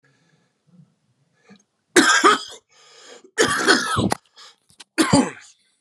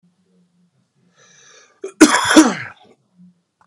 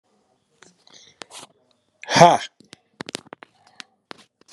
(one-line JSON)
{"three_cough_length": "5.8 s", "three_cough_amplitude": 31735, "three_cough_signal_mean_std_ratio": 0.4, "cough_length": "3.7 s", "cough_amplitude": 32768, "cough_signal_mean_std_ratio": 0.29, "exhalation_length": "4.5 s", "exhalation_amplitude": 32768, "exhalation_signal_mean_std_ratio": 0.19, "survey_phase": "beta (2021-08-13 to 2022-03-07)", "age": "45-64", "gender": "Male", "wearing_mask": "No", "symptom_cough_any": true, "symptom_fatigue": true, "symptom_fever_high_temperature": true, "smoker_status": "Current smoker (1 to 10 cigarettes per day)", "respiratory_condition_asthma": false, "respiratory_condition_other": false, "recruitment_source": "Test and Trace", "submission_delay": "2 days", "covid_test_result": "Positive", "covid_test_method": "RT-qPCR", "covid_ct_value": 25.2, "covid_ct_gene": "ORF1ab gene"}